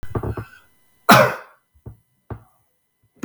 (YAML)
cough_length: 3.2 s
cough_amplitude: 32768
cough_signal_mean_std_ratio: 0.29
survey_phase: beta (2021-08-13 to 2022-03-07)
age: 45-64
gender: Male
wearing_mask: 'No'
symptom_none: true
smoker_status: Never smoked
respiratory_condition_asthma: false
respiratory_condition_other: false
recruitment_source: REACT
submission_delay: 2 days
covid_test_result: Negative
covid_test_method: RT-qPCR